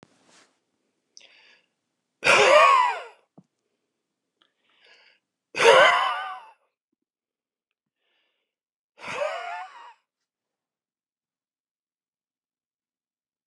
{"exhalation_length": "13.5 s", "exhalation_amplitude": 26436, "exhalation_signal_mean_std_ratio": 0.27, "survey_phase": "alpha (2021-03-01 to 2021-08-12)", "age": "45-64", "gender": "Male", "wearing_mask": "No", "symptom_none": true, "smoker_status": "Never smoked", "respiratory_condition_asthma": false, "respiratory_condition_other": false, "recruitment_source": "REACT", "submission_delay": "3 days", "covid_test_result": "Negative", "covid_test_method": "RT-qPCR"}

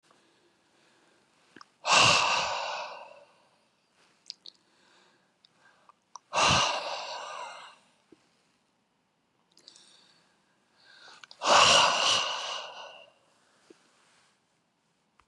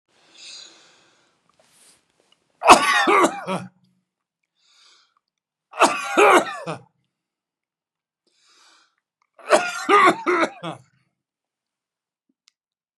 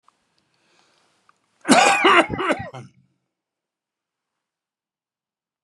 {"exhalation_length": "15.3 s", "exhalation_amplitude": 15947, "exhalation_signal_mean_std_ratio": 0.34, "three_cough_length": "13.0 s", "three_cough_amplitude": 32768, "three_cough_signal_mean_std_ratio": 0.31, "cough_length": "5.6 s", "cough_amplitude": 30426, "cough_signal_mean_std_ratio": 0.3, "survey_phase": "beta (2021-08-13 to 2022-03-07)", "age": "65+", "gender": "Male", "wearing_mask": "No", "symptom_none": true, "smoker_status": "Current smoker (11 or more cigarettes per day)", "respiratory_condition_asthma": false, "respiratory_condition_other": false, "recruitment_source": "REACT", "submission_delay": "2 days", "covid_test_result": "Negative", "covid_test_method": "RT-qPCR"}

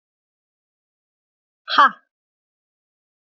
{"exhalation_length": "3.2 s", "exhalation_amplitude": 27562, "exhalation_signal_mean_std_ratio": 0.18, "survey_phase": "beta (2021-08-13 to 2022-03-07)", "age": "45-64", "gender": "Female", "wearing_mask": "No", "symptom_none": true, "smoker_status": "Never smoked", "respiratory_condition_asthma": false, "respiratory_condition_other": false, "recruitment_source": "Test and Trace", "submission_delay": "0 days", "covid_test_result": "Negative", "covid_test_method": "LFT"}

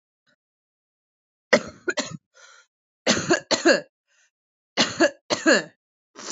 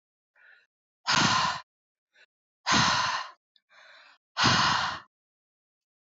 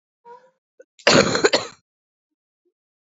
{"three_cough_length": "6.3 s", "three_cough_amplitude": 24741, "three_cough_signal_mean_std_ratio": 0.34, "exhalation_length": "6.1 s", "exhalation_amplitude": 11485, "exhalation_signal_mean_std_ratio": 0.44, "cough_length": "3.1 s", "cough_amplitude": 28592, "cough_signal_mean_std_ratio": 0.3, "survey_phase": "beta (2021-08-13 to 2022-03-07)", "age": "18-44", "gender": "Female", "wearing_mask": "No", "symptom_cough_any": true, "symptom_fatigue": true, "symptom_headache": true, "symptom_other": true, "smoker_status": "Current smoker (11 or more cigarettes per day)", "respiratory_condition_asthma": false, "respiratory_condition_other": false, "recruitment_source": "Test and Trace", "submission_delay": "2 days", "covid_test_result": "Positive", "covid_test_method": "RT-qPCR", "covid_ct_value": 18.8, "covid_ct_gene": "ORF1ab gene", "covid_ct_mean": 19.2, "covid_viral_load": "490000 copies/ml", "covid_viral_load_category": "Low viral load (10K-1M copies/ml)"}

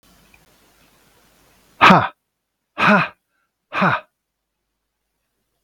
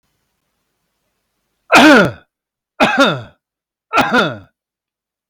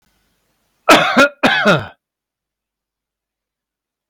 {"exhalation_length": "5.6 s", "exhalation_amplitude": 32768, "exhalation_signal_mean_std_ratio": 0.28, "three_cough_length": "5.3 s", "three_cough_amplitude": 32768, "three_cough_signal_mean_std_ratio": 0.38, "cough_length": "4.1 s", "cough_amplitude": 32768, "cough_signal_mean_std_ratio": 0.35, "survey_phase": "beta (2021-08-13 to 2022-03-07)", "age": "45-64", "gender": "Male", "wearing_mask": "No", "symptom_none": true, "smoker_status": "Ex-smoker", "respiratory_condition_asthma": false, "respiratory_condition_other": false, "recruitment_source": "REACT", "submission_delay": "5 days", "covid_test_result": "Negative", "covid_test_method": "RT-qPCR"}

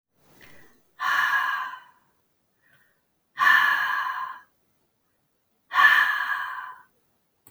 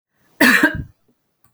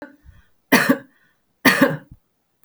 {"exhalation_length": "7.5 s", "exhalation_amplitude": 20890, "exhalation_signal_mean_std_ratio": 0.45, "cough_length": "1.5 s", "cough_amplitude": 32767, "cough_signal_mean_std_ratio": 0.39, "three_cough_length": "2.6 s", "three_cough_amplitude": 32768, "three_cough_signal_mean_std_ratio": 0.35, "survey_phase": "alpha (2021-03-01 to 2021-08-12)", "age": "45-64", "gender": "Female", "wearing_mask": "No", "symptom_none": true, "smoker_status": "Never smoked", "respiratory_condition_asthma": false, "respiratory_condition_other": false, "recruitment_source": "REACT", "submission_delay": "1 day", "covid_test_result": "Negative", "covid_test_method": "RT-qPCR"}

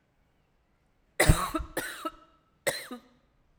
{"three_cough_length": "3.6 s", "three_cough_amplitude": 17937, "three_cough_signal_mean_std_ratio": 0.3, "survey_phase": "alpha (2021-03-01 to 2021-08-12)", "age": "45-64", "gender": "Female", "wearing_mask": "No", "symptom_cough_any": true, "symptom_fatigue": true, "symptom_headache": true, "symptom_change_to_sense_of_smell_or_taste": true, "smoker_status": "Never smoked", "respiratory_condition_asthma": false, "respiratory_condition_other": false, "recruitment_source": "Test and Trace", "submission_delay": "2 days", "covid_test_result": "Positive", "covid_test_method": "RT-qPCR", "covid_ct_value": 28.5, "covid_ct_gene": "ORF1ab gene", "covid_ct_mean": 28.8, "covid_viral_load": "360 copies/ml", "covid_viral_load_category": "Minimal viral load (< 10K copies/ml)"}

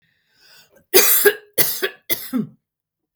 {"three_cough_length": "3.2 s", "three_cough_amplitude": 32766, "three_cough_signal_mean_std_ratio": 0.4, "survey_phase": "beta (2021-08-13 to 2022-03-07)", "age": "45-64", "gender": "Female", "wearing_mask": "No", "symptom_none": true, "smoker_status": "Ex-smoker", "respiratory_condition_asthma": false, "respiratory_condition_other": false, "recruitment_source": "REACT", "submission_delay": "1 day", "covid_test_result": "Negative", "covid_test_method": "RT-qPCR", "influenza_a_test_result": "Negative", "influenza_b_test_result": "Negative"}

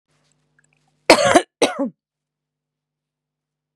{"cough_length": "3.8 s", "cough_amplitude": 32768, "cough_signal_mean_std_ratio": 0.25, "survey_phase": "beta (2021-08-13 to 2022-03-07)", "age": "18-44", "gender": "Female", "wearing_mask": "No", "symptom_none": true, "smoker_status": "Current smoker (1 to 10 cigarettes per day)", "respiratory_condition_asthma": false, "respiratory_condition_other": false, "recruitment_source": "REACT", "submission_delay": "3 days", "covid_test_result": "Negative", "covid_test_method": "RT-qPCR", "influenza_a_test_result": "Negative", "influenza_b_test_result": "Negative"}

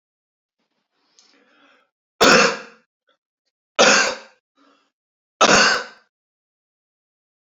{"three_cough_length": "7.6 s", "three_cough_amplitude": 32767, "three_cough_signal_mean_std_ratio": 0.3, "survey_phase": "beta (2021-08-13 to 2022-03-07)", "age": "45-64", "gender": "Male", "wearing_mask": "No", "symptom_none": true, "smoker_status": "Current smoker (1 to 10 cigarettes per day)", "respiratory_condition_asthma": false, "respiratory_condition_other": false, "recruitment_source": "REACT", "submission_delay": "1 day", "covid_test_result": "Negative", "covid_test_method": "RT-qPCR", "influenza_a_test_result": "Negative", "influenza_b_test_result": "Negative"}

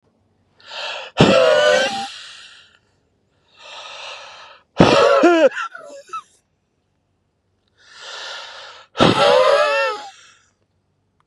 {"exhalation_length": "11.3 s", "exhalation_amplitude": 32768, "exhalation_signal_mean_std_ratio": 0.45, "survey_phase": "beta (2021-08-13 to 2022-03-07)", "age": "18-44", "gender": "Male", "wearing_mask": "No", "symptom_none": true, "symptom_onset": "8 days", "smoker_status": "Never smoked", "respiratory_condition_asthma": false, "respiratory_condition_other": false, "recruitment_source": "REACT", "submission_delay": "3 days", "covid_test_result": "Positive", "covid_test_method": "RT-qPCR", "covid_ct_value": 24.7, "covid_ct_gene": "E gene", "influenza_a_test_result": "Negative", "influenza_b_test_result": "Negative"}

